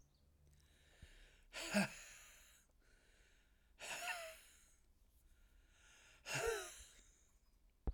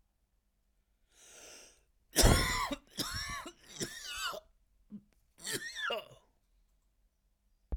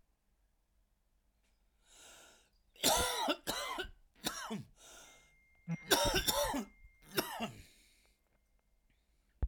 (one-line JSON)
{"exhalation_length": "7.9 s", "exhalation_amplitude": 1907, "exhalation_signal_mean_std_ratio": 0.38, "cough_length": "7.8 s", "cough_amplitude": 8939, "cough_signal_mean_std_ratio": 0.35, "three_cough_length": "9.5 s", "three_cough_amplitude": 6282, "three_cough_signal_mean_std_ratio": 0.41, "survey_phase": "alpha (2021-03-01 to 2021-08-12)", "age": "45-64", "gender": "Male", "wearing_mask": "No", "symptom_cough_any": true, "symptom_new_continuous_cough": true, "symptom_shortness_of_breath": true, "symptom_fatigue": true, "symptom_fever_high_temperature": true, "symptom_headache": true, "symptom_change_to_sense_of_smell_or_taste": true, "symptom_loss_of_taste": true, "symptom_onset": "5 days", "smoker_status": "Current smoker (e-cigarettes or vapes only)", "respiratory_condition_asthma": false, "respiratory_condition_other": false, "recruitment_source": "Test and Trace", "submission_delay": "1 day", "covid_test_result": "Positive", "covid_test_method": "RT-qPCR", "covid_ct_value": 13.8, "covid_ct_gene": "ORF1ab gene", "covid_ct_mean": 13.9, "covid_viral_load": "27000000 copies/ml", "covid_viral_load_category": "High viral load (>1M copies/ml)"}